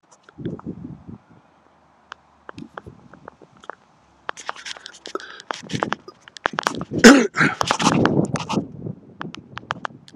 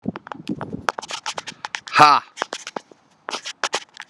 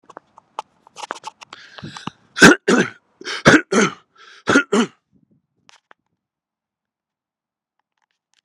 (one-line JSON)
{"cough_length": "10.2 s", "cough_amplitude": 32768, "cough_signal_mean_std_ratio": 0.31, "exhalation_length": "4.1 s", "exhalation_amplitude": 32768, "exhalation_signal_mean_std_ratio": 0.32, "three_cough_length": "8.4 s", "three_cough_amplitude": 32768, "three_cough_signal_mean_std_ratio": 0.27, "survey_phase": "beta (2021-08-13 to 2022-03-07)", "age": "45-64", "gender": "Male", "wearing_mask": "No", "symptom_none": true, "smoker_status": "Current smoker (11 or more cigarettes per day)", "respiratory_condition_asthma": false, "respiratory_condition_other": false, "recruitment_source": "REACT", "submission_delay": "3 days", "covid_test_result": "Negative", "covid_test_method": "RT-qPCR"}